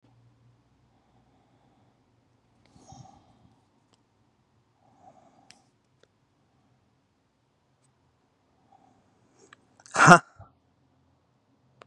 {
  "exhalation_length": "11.9 s",
  "exhalation_amplitude": 32767,
  "exhalation_signal_mean_std_ratio": 0.11,
  "survey_phase": "beta (2021-08-13 to 2022-03-07)",
  "age": "18-44",
  "gender": "Male",
  "wearing_mask": "No",
  "symptom_none": true,
  "smoker_status": "Current smoker (1 to 10 cigarettes per day)",
  "respiratory_condition_asthma": false,
  "respiratory_condition_other": false,
  "recruitment_source": "REACT",
  "submission_delay": "3 days",
  "covid_test_result": "Negative",
  "covid_test_method": "RT-qPCR",
  "influenza_a_test_result": "Negative",
  "influenza_b_test_result": "Negative"
}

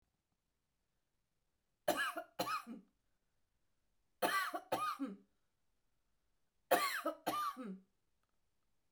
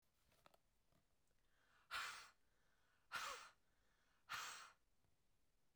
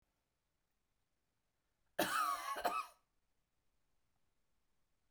{
  "three_cough_length": "8.9 s",
  "three_cough_amplitude": 4538,
  "three_cough_signal_mean_std_ratio": 0.39,
  "exhalation_length": "5.8 s",
  "exhalation_amplitude": 593,
  "exhalation_signal_mean_std_ratio": 0.4,
  "cough_length": "5.1 s",
  "cough_amplitude": 2360,
  "cough_signal_mean_std_ratio": 0.32,
  "survey_phase": "beta (2021-08-13 to 2022-03-07)",
  "age": "45-64",
  "gender": "Female",
  "wearing_mask": "No",
  "symptom_none": true,
  "smoker_status": "Ex-smoker",
  "respiratory_condition_asthma": false,
  "respiratory_condition_other": false,
  "recruitment_source": "Test and Trace",
  "submission_delay": "1 day",
  "covid_test_result": "Negative",
  "covid_test_method": "RT-qPCR"
}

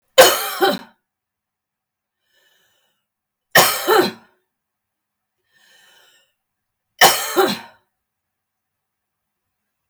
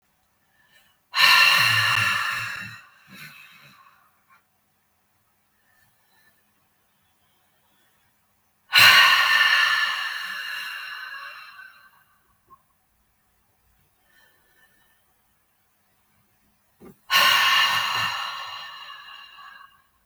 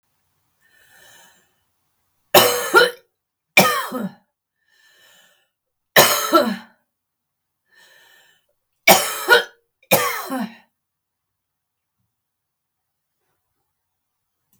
{
  "three_cough_length": "9.9 s",
  "three_cough_amplitude": 32768,
  "three_cough_signal_mean_std_ratio": 0.28,
  "exhalation_length": "20.1 s",
  "exhalation_amplitude": 30884,
  "exhalation_signal_mean_std_ratio": 0.38,
  "cough_length": "14.6 s",
  "cough_amplitude": 32768,
  "cough_signal_mean_std_ratio": 0.29,
  "survey_phase": "beta (2021-08-13 to 2022-03-07)",
  "age": "65+",
  "gender": "Female",
  "wearing_mask": "No",
  "symptom_none": true,
  "smoker_status": "Ex-smoker",
  "respiratory_condition_asthma": false,
  "respiratory_condition_other": false,
  "recruitment_source": "REACT",
  "submission_delay": "1 day",
  "covid_test_result": "Negative",
  "covid_test_method": "RT-qPCR"
}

